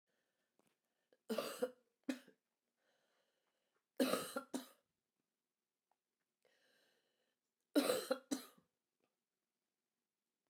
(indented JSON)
{
  "three_cough_length": "10.5 s",
  "three_cough_amplitude": 2550,
  "three_cough_signal_mean_std_ratio": 0.25,
  "survey_phase": "beta (2021-08-13 to 2022-03-07)",
  "age": "45-64",
  "gender": "Female",
  "wearing_mask": "No",
  "symptom_cough_any": true,
  "symptom_runny_or_blocked_nose": true,
  "symptom_sore_throat": true,
  "symptom_fatigue": true,
  "symptom_other": true,
  "smoker_status": "Never smoked",
  "respiratory_condition_asthma": true,
  "respiratory_condition_other": false,
  "recruitment_source": "Test and Trace",
  "submission_delay": "2 days",
  "covid_test_result": "Positive",
  "covid_test_method": "RT-qPCR",
  "covid_ct_value": 21.4,
  "covid_ct_gene": "N gene"
}